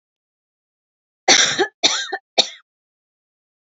{"three_cough_length": "3.7 s", "three_cough_amplitude": 32768, "three_cough_signal_mean_std_ratio": 0.32, "survey_phase": "beta (2021-08-13 to 2022-03-07)", "age": "45-64", "gender": "Female", "wearing_mask": "No", "symptom_none": true, "smoker_status": "Never smoked", "respiratory_condition_asthma": false, "respiratory_condition_other": false, "recruitment_source": "REACT", "submission_delay": "1 day", "covid_test_result": "Negative", "covid_test_method": "RT-qPCR", "influenza_a_test_result": "Negative", "influenza_b_test_result": "Negative"}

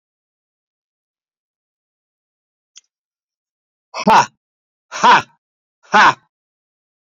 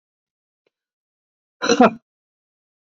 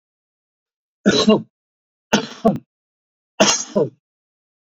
{"exhalation_length": "7.1 s", "exhalation_amplitude": 32768, "exhalation_signal_mean_std_ratio": 0.25, "cough_length": "3.0 s", "cough_amplitude": 27260, "cough_signal_mean_std_ratio": 0.21, "three_cough_length": "4.6 s", "three_cough_amplitude": 27588, "three_cough_signal_mean_std_ratio": 0.34, "survey_phase": "beta (2021-08-13 to 2022-03-07)", "age": "65+", "gender": "Male", "wearing_mask": "No", "symptom_cough_any": true, "symptom_onset": "5 days", "smoker_status": "Never smoked", "respiratory_condition_asthma": false, "respiratory_condition_other": false, "recruitment_source": "REACT", "submission_delay": "2 days", "covid_test_result": "Negative", "covid_test_method": "RT-qPCR", "influenza_a_test_result": "Negative", "influenza_b_test_result": "Negative"}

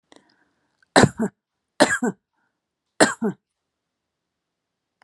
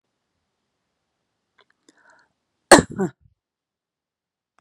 {"three_cough_length": "5.0 s", "three_cough_amplitude": 32767, "three_cough_signal_mean_std_ratio": 0.25, "cough_length": "4.6 s", "cough_amplitude": 32768, "cough_signal_mean_std_ratio": 0.14, "survey_phase": "beta (2021-08-13 to 2022-03-07)", "age": "45-64", "gender": "Female", "wearing_mask": "No", "symptom_none": true, "smoker_status": "Ex-smoker", "respiratory_condition_asthma": false, "respiratory_condition_other": false, "recruitment_source": "REACT", "submission_delay": "1 day", "covid_test_result": "Negative", "covid_test_method": "RT-qPCR"}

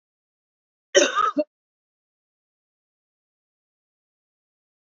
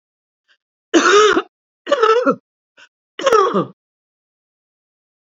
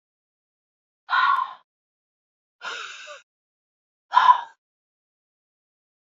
{"cough_length": "4.9 s", "cough_amplitude": 28199, "cough_signal_mean_std_ratio": 0.21, "three_cough_length": "5.2 s", "three_cough_amplitude": 29543, "three_cough_signal_mean_std_ratio": 0.41, "exhalation_length": "6.1 s", "exhalation_amplitude": 24889, "exhalation_signal_mean_std_ratio": 0.26, "survey_phase": "beta (2021-08-13 to 2022-03-07)", "age": "65+", "gender": "Female", "wearing_mask": "No", "symptom_cough_any": true, "symptom_runny_or_blocked_nose": true, "symptom_fatigue": true, "symptom_change_to_sense_of_smell_or_taste": true, "symptom_onset": "5 days", "smoker_status": "Ex-smoker", "respiratory_condition_asthma": false, "respiratory_condition_other": false, "recruitment_source": "Test and Trace", "submission_delay": "2 days", "covid_test_result": "Positive", "covid_test_method": "RT-qPCR", "covid_ct_value": 18.8, "covid_ct_gene": "N gene"}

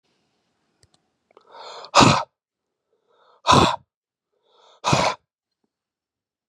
{"exhalation_length": "6.5 s", "exhalation_amplitude": 30973, "exhalation_signal_mean_std_ratio": 0.27, "survey_phase": "beta (2021-08-13 to 2022-03-07)", "age": "45-64", "gender": "Male", "wearing_mask": "No", "symptom_fatigue": true, "smoker_status": "Ex-smoker", "respiratory_condition_asthma": false, "respiratory_condition_other": false, "recruitment_source": "REACT", "submission_delay": "1 day", "covid_test_result": "Negative", "covid_test_method": "RT-qPCR", "influenza_a_test_result": "Negative", "influenza_b_test_result": "Negative"}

